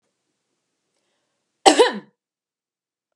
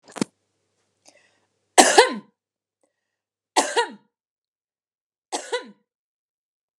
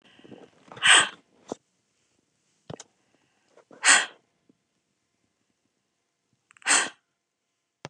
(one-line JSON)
{"cough_length": "3.2 s", "cough_amplitude": 32768, "cough_signal_mean_std_ratio": 0.21, "three_cough_length": "6.8 s", "three_cough_amplitude": 32767, "three_cough_signal_mean_std_ratio": 0.23, "exhalation_length": "7.9 s", "exhalation_amplitude": 27178, "exhalation_signal_mean_std_ratio": 0.23, "survey_phase": "beta (2021-08-13 to 2022-03-07)", "age": "45-64", "gender": "Female", "wearing_mask": "No", "symptom_none": true, "smoker_status": "Never smoked", "respiratory_condition_asthma": false, "respiratory_condition_other": false, "recruitment_source": "REACT", "submission_delay": "3 days", "covid_test_result": "Negative", "covid_test_method": "RT-qPCR", "influenza_a_test_result": "Negative", "influenza_b_test_result": "Negative"}